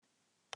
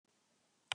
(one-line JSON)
{"exhalation_length": "0.6 s", "exhalation_amplitude": 1969, "exhalation_signal_mean_std_ratio": 0.15, "three_cough_length": "0.7 s", "three_cough_amplitude": 3559, "three_cough_signal_mean_std_ratio": 0.11, "survey_phase": "beta (2021-08-13 to 2022-03-07)", "age": "65+", "gender": "Female", "wearing_mask": "No", "symptom_none": true, "symptom_onset": "10 days", "smoker_status": "Ex-smoker", "respiratory_condition_asthma": false, "respiratory_condition_other": false, "recruitment_source": "REACT", "submission_delay": "2 days", "covid_test_result": "Negative", "covid_test_method": "RT-qPCR", "influenza_a_test_result": "Negative", "influenza_b_test_result": "Negative"}